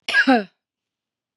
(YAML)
cough_length: 1.4 s
cough_amplitude: 24884
cough_signal_mean_std_ratio: 0.38
survey_phase: beta (2021-08-13 to 2022-03-07)
age: 65+
gender: Female
wearing_mask: 'No'
symptom_none: true
smoker_status: Ex-smoker
respiratory_condition_asthma: false
respiratory_condition_other: false
recruitment_source: REACT
submission_delay: 1 day
covid_test_result: Negative
covid_test_method: RT-qPCR
influenza_a_test_result: Negative
influenza_b_test_result: Negative